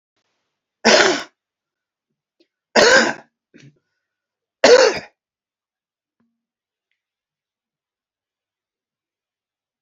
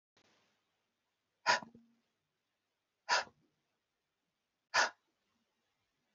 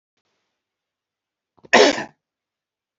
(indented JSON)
{
  "three_cough_length": "9.8 s",
  "three_cough_amplitude": 32767,
  "three_cough_signal_mean_std_ratio": 0.25,
  "exhalation_length": "6.1 s",
  "exhalation_amplitude": 5131,
  "exhalation_signal_mean_std_ratio": 0.21,
  "cough_length": "3.0 s",
  "cough_amplitude": 32767,
  "cough_signal_mean_std_ratio": 0.22,
  "survey_phase": "beta (2021-08-13 to 2022-03-07)",
  "age": "45-64",
  "gender": "Male",
  "wearing_mask": "No",
  "symptom_cough_any": true,
  "symptom_runny_or_blocked_nose": true,
  "symptom_headache": true,
  "symptom_onset": "3 days",
  "smoker_status": "Never smoked",
  "respiratory_condition_asthma": false,
  "respiratory_condition_other": false,
  "recruitment_source": "Test and Trace",
  "submission_delay": "2 days",
  "covid_test_result": "Positive",
  "covid_test_method": "RT-qPCR",
  "covid_ct_value": 18.5,
  "covid_ct_gene": "ORF1ab gene",
  "covid_ct_mean": 18.8,
  "covid_viral_load": "660000 copies/ml",
  "covid_viral_load_category": "Low viral load (10K-1M copies/ml)"
}